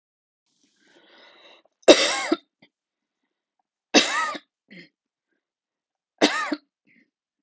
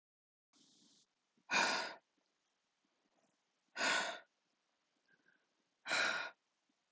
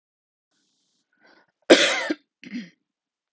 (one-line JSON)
{"three_cough_length": "7.4 s", "three_cough_amplitude": 32768, "three_cough_signal_mean_std_ratio": 0.25, "exhalation_length": "6.9 s", "exhalation_amplitude": 2632, "exhalation_signal_mean_std_ratio": 0.34, "cough_length": "3.3 s", "cough_amplitude": 32575, "cough_signal_mean_std_ratio": 0.24, "survey_phase": "alpha (2021-03-01 to 2021-08-12)", "age": "45-64", "gender": "Female", "wearing_mask": "No", "symptom_none": true, "smoker_status": "Never smoked", "respiratory_condition_asthma": false, "respiratory_condition_other": false, "recruitment_source": "REACT", "submission_delay": "32 days", "covid_test_result": "Negative", "covid_test_method": "RT-qPCR"}